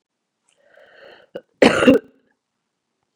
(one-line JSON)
{"cough_length": "3.2 s", "cough_amplitude": 32767, "cough_signal_mean_std_ratio": 0.25, "survey_phase": "beta (2021-08-13 to 2022-03-07)", "age": "45-64", "gender": "Female", "wearing_mask": "No", "symptom_cough_any": true, "symptom_runny_or_blocked_nose": true, "symptom_headache": true, "symptom_onset": "4 days", "smoker_status": "Never smoked", "respiratory_condition_asthma": false, "respiratory_condition_other": false, "recruitment_source": "Test and Trace", "submission_delay": "2 days", "covid_test_result": "Positive", "covid_test_method": "ePCR"}